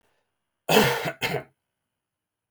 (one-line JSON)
{"cough_length": "2.5 s", "cough_amplitude": 17786, "cough_signal_mean_std_ratio": 0.36, "survey_phase": "beta (2021-08-13 to 2022-03-07)", "age": "45-64", "gender": "Male", "wearing_mask": "No", "symptom_cough_any": true, "symptom_fatigue": true, "symptom_change_to_sense_of_smell_or_taste": true, "symptom_loss_of_taste": true, "smoker_status": "Ex-smoker", "respiratory_condition_asthma": false, "respiratory_condition_other": false, "recruitment_source": "REACT", "submission_delay": "2 days", "covid_test_result": "Negative", "covid_test_method": "RT-qPCR"}